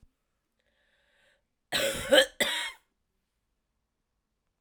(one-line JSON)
{"cough_length": "4.6 s", "cough_amplitude": 17505, "cough_signal_mean_std_ratio": 0.28, "survey_phase": "alpha (2021-03-01 to 2021-08-12)", "age": "45-64", "gender": "Female", "wearing_mask": "No", "symptom_cough_any": true, "symptom_fatigue": true, "symptom_onset": "3 days", "smoker_status": "Never smoked", "respiratory_condition_asthma": false, "respiratory_condition_other": false, "recruitment_source": "Test and Trace", "submission_delay": "2 days", "covid_test_result": "Positive", "covid_test_method": "RT-qPCR"}